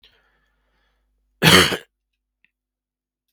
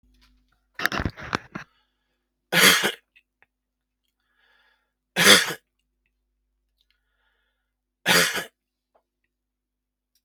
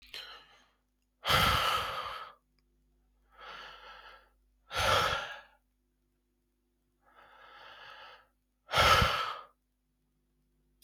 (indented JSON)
{
  "cough_length": "3.3 s",
  "cough_amplitude": 32768,
  "cough_signal_mean_std_ratio": 0.24,
  "three_cough_length": "10.2 s",
  "three_cough_amplitude": 32741,
  "three_cough_signal_mean_std_ratio": 0.26,
  "exhalation_length": "10.8 s",
  "exhalation_amplitude": 8488,
  "exhalation_signal_mean_std_ratio": 0.37,
  "survey_phase": "beta (2021-08-13 to 2022-03-07)",
  "age": "45-64",
  "gender": "Male",
  "wearing_mask": "No",
  "symptom_cough_any": true,
  "symptom_runny_or_blocked_nose": true,
  "symptom_sore_throat": true,
  "symptom_fever_high_temperature": true,
  "symptom_change_to_sense_of_smell_or_taste": true,
  "symptom_loss_of_taste": true,
  "symptom_onset": "3 days",
  "smoker_status": "Never smoked",
  "respiratory_condition_asthma": false,
  "respiratory_condition_other": false,
  "recruitment_source": "Test and Trace",
  "submission_delay": "1 day",
  "covid_test_result": "Positive",
  "covid_test_method": "RT-qPCR"
}